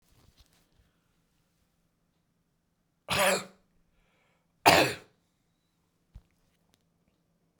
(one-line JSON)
{"cough_length": "7.6 s", "cough_amplitude": 26784, "cough_signal_mean_std_ratio": 0.21, "survey_phase": "beta (2021-08-13 to 2022-03-07)", "age": "45-64", "gender": "Male", "wearing_mask": "No", "symptom_none": true, "smoker_status": "Never smoked", "respiratory_condition_asthma": false, "respiratory_condition_other": true, "recruitment_source": "REACT", "submission_delay": "3 days", "covid_test_result": "Negative", "covid_test_method": "RT-qPCR"}